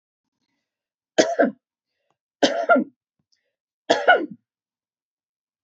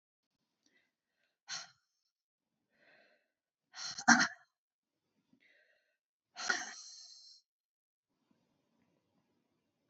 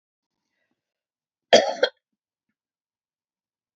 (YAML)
three_cough_length: 5.6 s
three_cough_amplitude: 27665
three_cough_signal_mean_std_ratio: 0.3
exhalation_length: 9.9 s
exhalation_amplitude: 11627
exhalation_signal_mean_std_ratio: 0.18
cough_length: 3.8 s
cough_amplitude: 27584
cough_signal_mean_std_ratio: 0.18
survey_phase: beta (2021-08-13 to 2022-03-07)
age: 65+
gender: Female
wearing_mask: 'No'
symptom_none: true
smoker_status: Never smoked
respiratory_condition_asthma: false
respiratory_condition_other: false
recruitment_source: REACT
submission_delay: 1 day
covid_test_result: Negative
covid_test_method: RT-qPCR
influenza_a_test_result: Negative
influenza_b_test_result: Negative